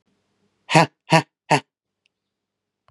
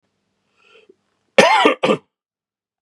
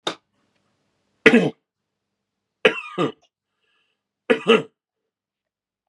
{"exhalation_length": "2.9 s", "exhalation_amplitude": 32764, "exhalation_signal_mean_std_ratio": 0.24, "cough_length": "2.8 s", "cough_amplitude": 32768, "cough_signal_mean_std_ratio": 0.33, "three_cough_length": "5.9 s", "three_cough_amplitude": 32768, "three_cough_signal_mean_std_ratio": 0.25, "survey_phase": "beta (2021-08-13 to 2022-03-07)", "age": "18-44", "gender": "Male", "wearing_mask": "No", "symptom_sore_throat": true, "symptom_onset": "3 days", "smoker_status": "Never smoked", "respiratory_condition_asthma": false, "respiratory_condition_other": false, "recruitment_source": "Test and Trace", "submission_delay": "2 days", "covid_test_result": "Positive", "covid_test_method": "RT-qPCR"}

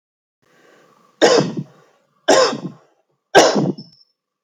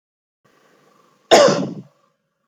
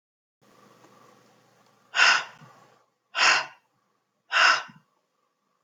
{"three_cough_length": "4.4 s", "three_cough_amplitude": 30568, "three_cough_signal_mean_std_ratio": 0.38, "cough_length": "2.5 s", "cough_amplitude": 32767, "cough_signal_mean_std_ratio": 0.3, "exhalation_length": "5.6 s", "exhalation_amplitude": 20676, "exhalation_signal_mean_std_ratio": 0.31, "survey_phase": "alpha (2021-03-01 to 2021-08-12)", "age": "45-64", "gender": "Female", "wearing_mask": "No", "symptom_none": true, "smoker_status": "Never smoked", "respiratory_condition_asthma": false, "respiratory_condition_other": false, "recruitment_source": "REACT", "submission_delay": "6 days", "covid_test_result": "Negative", "covid_test_method": "RT-qPCR"}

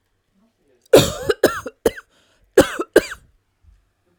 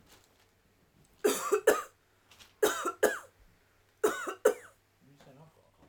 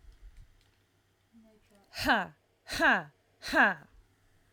{"cough_length": "4.2 s", "cough_amplitude": 32768, "cough_signal_mean_std_ratio": 0.28, "three_cough_length": "5.9 s", "three_cough_amplitude": 10870, "three_cough_signal_mean_std_ratio": 0.34, "exhalation_length": "4.5 s", "exhalation_amplitude": 7885, "exhalation_signal_mean_std_ratio": 0.35, "survey_phase": "alpha (2021-03-01 to 2021-08-12)", "age": "18-44", "gender": "Female", "wearing_mask": "No", "symptom_none": true, "smoker_status": "Ex-smoker", "respiratory_condition_asthma": false, "respiratory_condition_other": false, "recruitment_source": "REACT", "submission_delay": "1 day", "covid_test_result": "Negative", "covid_test_method": "RT-qPCR"}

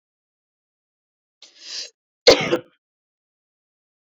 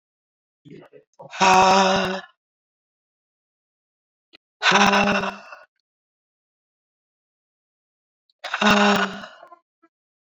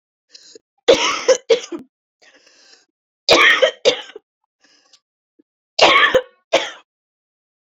{"cough_length": "4.0 s", "cough_amplitude": 28690, "cough_signal_mean_std_ratio": 0.19, "exhalation_length": "10.2 s", "exhalation_amplitude": 26409, "exhalation_signal_mean_std_ratio": 0.36, "three_cough_length": "7.7 s", "three_cough_amplitude": 29867, "three_cough_signal_mean_std_ratio": 0.36, "survey_phase": "beta (2021-08-13 to 2022-03-07)", "age": "18-44", "gender": "Female", "wearing_mask": "No", "symptom_cough_any": true, "symptom_fatigue": true, "symptom_headache": true, "symptom_change_to_sense_of_smell_or_taste": true, "symptom_loss_of_taste": true, "symptom_onset": "7 days", "smoker_status": "Never smoked", "respiratory_condition_asthma": false, "respiratory_condition_other": false, "recruitment_source": "Test and Trace", "submission_delay": "2 days", "covid_test_result": "Positive", "covid_test_method": "RT-qPCR", "covid_ct_value": 23.2, "covid_ct_gene": "ORF1ab gene", "covid_ct_mean": 23.7, "covid_viral_load": "17000 copies/ml", "covid_viral_load_category": "Low viral load (10K-1M copies/ml)"}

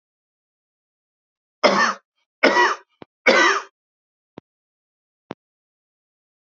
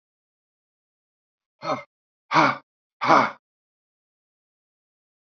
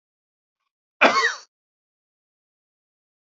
{"three_cough_length": "6.5 s", "three_cough_amplitude": 32767, "three_cough_signal_mean_std_ratio": 0.3, "exhalation_length": "5.4 s", "exhalation_amplitude": 26453, "exhalation_signal_mean_std_ratio": 0.25, "cough_length": "3.3 s", "cough_amplitude": 28950, "cough_signal_mean_std_ratio": 0.23, "survey_phase": "alpha (2021-03-01 to 2021-08-12)", "age": "65+", "gender": "Male", "wearing_mask": "No", "symptom_none": true, "smoker_status": "Never smoked", "respiratory_condition_asthma": false, "respiratory_condition_other": false, "recruitment_source": "REACT", "submission_delay": "4 days", "covid_test_result": "Negative", "covid_test_method": "RT-qPCR"}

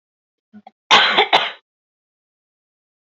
{"cough_length": "3.2 s", "cough_amplitude": 32768, "cough_signal_mean_std_ratio": 0.31, "survey_phase": "beta (2021-08-13 to 2022-03-07)", "age": "18-44", "gender": "Female", "wearing_mask": "No", "symptom_none": true, "smoker_status": "Never smoked", "respiratory_condition_asthma": false, "respiratory_condition_other": false, "recruitment_source": "REACT", "submission_delay": "1 day", "covid_test_result": "Negative", "covid_test_method": "RT-qPCR", "influenza_a_test_result": "Negative", "influenza_b_test_result": "Negative"}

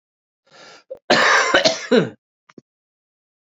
{"cough_length": "3.5 s", "cough_amplitude": 30411, "cough_signal_mean_std_ratio": 0.4, "survey_phase": "beta (2021-08-13 to 2022-03-07)", "age": "18-44", "gender": "Male", "wearing_mask": "No", "symptom_cough_any": true, "symptom_runny_or_blocked_nose": true, "symptom_abdominal_pain": true, "symptom_fatigue": true, "symptom_fever_high_temperature": true, "symptom_headache": true, "symptom_change_to_sense_of_smell_or_taste": true, "symptom_loss_of_taste": true, "symptom_onset": "4 days", "smoker_status": "Never smoked", "respiratory_condition_asthma": true, "respiratory_condition_other": false, "recruitment_source": "Test and Trace", "submission_delay": "1 day", "covid_test_result": "Positive", "covid_test_method": "RT-qPCR", "covid_ct_value": 21.8, "covid_ct_gene": "ORF1ab gene", "covid_ct_mean": 22.2, "covid_viral_load": "52000 copies/ml", "covid_viral_load_category": "Low viral load (10K-1M copies/ml)"}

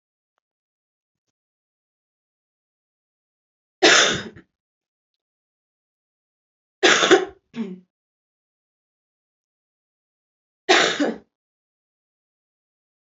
{"three_cough_length": "13.1 s", "three_cough_amplitude": 29385, "three_cough_signal_mean_std_ratio": 0.23, "survey_phase": "alpha (2021-03-01 to 2021-08-12)", "age": "18-44", "gender": "Female", "wearing_mask": "No", "symptom_cough_any": true, "symptom_shortness_of_breath": true, "symptom_fatigue": true, "symptom_fever_high_temperature": true, "symptom_headache": true, "symptom_onset": "3 days", "smoker_status": "Never smoked", "respiratory_condition_asthma": false, "respiratory_condition_other": false, "recruitment_source": "Test and Trace", "submission_delay": "1 day", "covid_test_result": "Positive", "covid_test_method": "ePCR"}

